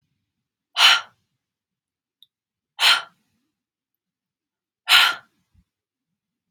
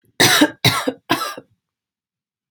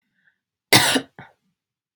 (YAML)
exhalation_length: 6.5 s
exhalation_amplitude: 31827
exhalation_signal_mean_std_ratio: 0.25
three_cough_length: 2.5 s
three_cough_amplitude: 32767
three_cough_signal_mean_std_ratio: 0.41
cough_length: 2.0 s
cough_amplitude: 32767
cough_signal_mean_std_ratio: 0.29
survey_phase: alpha (2021-03-01 to 2021-08-12)
age: 18-44
gender: Female
wearing_mask: 'No'
symptom_none: true
smoker_status: Never smoked
respiratory_condition_asthma: false
respiratory_condition_other: false
recruitment_source: REACT
submission_delay: 2 days
covid_test_result: Negative
covid_test_method: RT-qPCR